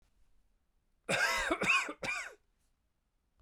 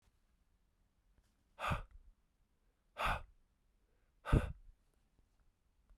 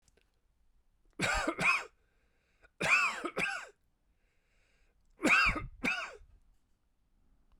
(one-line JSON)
{"cough_length": "3.4 s", "cough_amplitude": 4102, "cough_signal_mean_std_ratio": 0.46, "exhalation_length": "6.0 s", "exhalation_amplitude": 4996, "exhalation_signal_mean_std_ratio": 0.25, "three_cough_length": "7.6 s", "three_cough_amplitude": 6551, "three_cough_signal_mean_std_ratio": 0.41, "survey_phase": "beta (2021-08-13 to 2022-03-07)", "age": "45-64", "gender": "Male", "wearing_mask": "No", "symptom_cough_any": true, "symptom_fatigue": true, "symptom_headache": true, "symptom_change_to_sense_of_smell_or_taste": true, "symptom_loss_of_taste": true, "smoker_status": "Never smoked", "respiratory_condition_asthma": false, "respiratory_condition_other": false, "recruitment_source": "Test and Trace", "submission_delay": "2 days", "covid_test_result": "Positive", "covid_test_method": "RT-qPCR", "covid_ct_value": 19.4, "covid_ct_gene": "ORF1ab gene", "covid_ct_mean": 20.3, "covid_viral_load": "210000 copies/ml", "covid_viral_load_category": "Low viral load (10K-1M copies/ml)"}